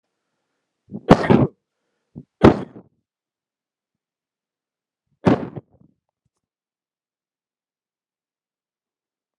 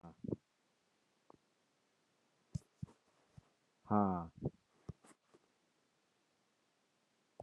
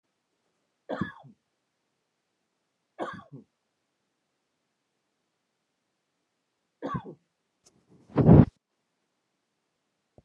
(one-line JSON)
{"cough_length": "9.4 s", "cough_amplitude": 32768, "cough_signal_mean_std_ratio": 0.19, "exhalation_length": "7.4 s", "exhalation_amplitude": 3883, "exhalation_signal_mean_std_ratio": 0.21, "three_cough_length": "10.2 s", "three_cough_amplitude": 24867, "three_cough_signal_mean_std_ratio": 0.16, "survey_phase": "beta (2021-08-13 to 2022-03-07)", "age": "45-64", "gender": "Male", "wearing_mask": "No", "symptom_cough_any": true, "smoker_status": "Ex-smoker", "respiratory_condition_asthma": false, "respiratory_condition_other": false, "recruitment_source": "REACT", "submission_delay": "1 day", "covid_test_result": "Negative", "covid_test_method": "RT-qPCR"}